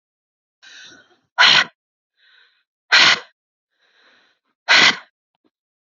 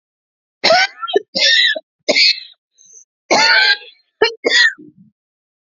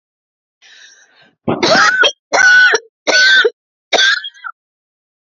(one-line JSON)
{"exhalation_length": "5.9 s", "exhalation_amplitude": 31987, "exhalation_signal_mean_std_ratio": 0.3, "cough_length": "5.6 s", "cough_amplitude": 32629, "cough_signal_mean_std_ratio": 0.5, "three_cough_length": "5.4 s", "three_cough_amplitude": 32617, "three_cough_signal_mean_std_ratio": 0.52, "survey_phase": "beta (2021-08-13 to 2022-03-07)", "age": "45-64", "gender": "Female", "wearing_mask": "No", "symptom_abdominal_pain": true, "symptom_headache": true, "smoker_status": "Never smoked", "respiratory_condition_asthma": false, "respiratory_condition_other": false, "recruitment_source": "REACT", "submission_delay": "-2 days", "covid_test_result": "Negative", "covid_test_method": "RT-qPCR", "influenza_a_test_result": "Negative", "influenza_b_test_result": "Negative"}